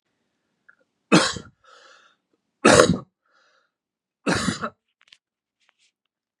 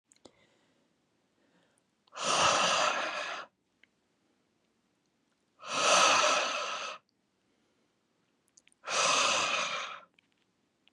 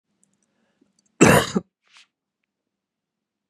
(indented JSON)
{
  "three_cough_length": "6.4 s",
  "three_cough_amplitude": 32768,
  "three_cough_signal_mean_std_ratio": 0.26,
  "exhalation_length": "10.9 s",
  "exhalation_amplitude": 7857,
  "exhalation_signal_mean_std_ratio": 0.45,
  "cough_length": "3.5 s",
  "cough_amplitude": 30896,
  "cough_signal_mean_std_ratio": 0.22,
  "survey_phase": "beta (2021-08-13 to 2022-03-07)",
  "age": "45-64",
  "gender": "Male",
  "wearing_mask": "No",
  "symptom_none": true,
  "smoker_status": "Never smoked",
  "respiratory_condition_asthma": false,
  "respiratory_condition_other": false,
  "recruitment_source": "REACT",
  "submission_delay": "2 days",
  "covid_test_result": "Negative",
  "covid_test_method": "RT-qPCR",
  "influenza_a_test_result": "Negative",
  "influenza_b_test_result": "Negative"
}